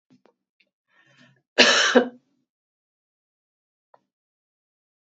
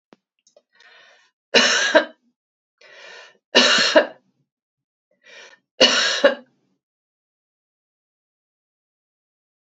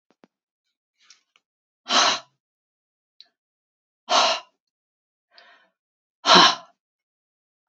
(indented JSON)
{
  "cough_length": "5.0 s",
  "cough_amplitude": 30122,
  "cough_signal_mean_std_ratio": 0.23,
  "three_cough_length": "9.6 s",
  "three_cough_amplitude": 30677,
  "three_cough_signal_mean_std_ratio": 0.3,
  "exhalation_length": "7.7 s",
  "exhalation_amplitude": 30153,
  "exhalation_signal_mean_std_ratio": 0.25,
  "survey_phase": "beta (2021-08-13 to 2022-03-07)",
  "age": "65+",
  "gender": "Female",
  "wearing_mask": "No",
  "symptom_none": true,
  "smoker_status": "Never smoked",
  "respiratory_condition_asthma": false,
  "respiratory_condition_other": false,
  "recruitment_source": "REACT",
  "submission_delay": "1 day",
  "covid_test_result": "Negative",
  "covid_test_method": "RT-qPCR",
  "influenza_a_test_result": "Negative",
  "influenza_b_test_result": "Negative"
}